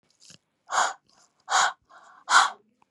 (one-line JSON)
{"exhalation_length": "2.9 s", "exhalation_amplitude": 23029, "exhalation_signal_mean_std_ratio": 0.36, "survey_phase": "beta (2021-08-13 to 2022-03-07)", "age": "18-44", "gender": "Female", "wearing_mask": "No", "symptom_cough_any": true, "symptom_runny_or_blocked_nose": true, "symptom_sore_throat": true, "symptom_fatigue": true, "symptom_onset": "3 days", "smoker_status": "Never smoked", "respiratory_condition_asthma": false, "respiratory_condition_other": false, "recruitment_source": "Test and Trace", "submission_delay": "1 day", "covid_test_result": "Positive", "covid_test_method": "RT-qPCR", "covid_ct_value": 21.7, "covid_ct_gene": "ORF1ab gene"}